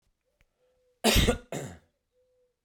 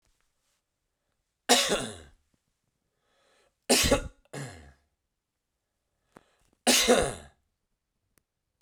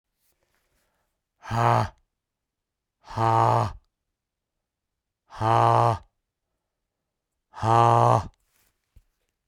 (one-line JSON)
{"cough_length": "2.6 s", "cough_amplitude": 12410, "cough_signal_mean_std_ratio": 0.31, "three_cough_length": "8.6 s", "three_cough_amplitude": 17159, "three_cough_signal_mean_std_ratio": 0.29, "exhalation_length": "9.5 s", "exhalation_amplitude": 17605, "exhalation_signal_mean_std_ratio": 0.37, "survey_phase": "beta (2021-08-13 to 2022-03-07)", "age": "18-44", "gender": "Male", "wearing_mask": "No", "symptom_cough_any": true, "symptom_runny_or_blocked_nose": true, "symptom_sore_throat": true, "symptom_headache": true, "symptom_change_to_sense_of_smell_or_taste": true, "symptom_onset": "3 days", "smoker_status": "Never smoked", "respiratory_condition_asthma": false, "respiratory_condition_other": false, "recruitment_source": "Test and Trace", "submission_delay": "1 day", "covid_test_result": "Positive", "covid_test_method": "RT-qPCR", "covid_ct_value": 19.2, "covid_ct_gene": "ORF1ab gene"}